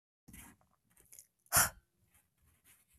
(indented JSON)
{
  "exhalation_length": "3.0 s",
  "exhalation_amplitude": 5816,
  "exhalation_signal_mean_std_ratio": 0.21,
  "survey_phase": "beta (2021-08-13 to 2022-03-07)",
  "age": "18-44",
  "gender": "Male",
  "wearing_mask": "No",
  "symptom_cough_any": true,
  "symptom_runny_or_blocked_nose": true,
  "symptom_fatigue": true,
  "symptom_change_to_sense_of_smell_or_taste": true,
  "symptom_loss_of_taste": true,
  "symptom_onset": "4 days",
  "smoker_status": "Never smoked",
  "respiratory_condition_asthma": false,
  "respiratory_condition_other": false,
  "recruitment_source": "Test and Trace",
  "submission_delay": "2 days",
  "covid_test_result": "Positive",
  "covid_test_method": "RT-qPCR",
  "covid_ct_value": 18.4,
  "covid_ct_gene": "ORF1ab gene",
  "covid_ct_mean": 19.2,
  "covid_viral_load": "510000 copies/ml",
  "covid_viral_load_category": "Low viral load (10K-1M copies/ml)"
}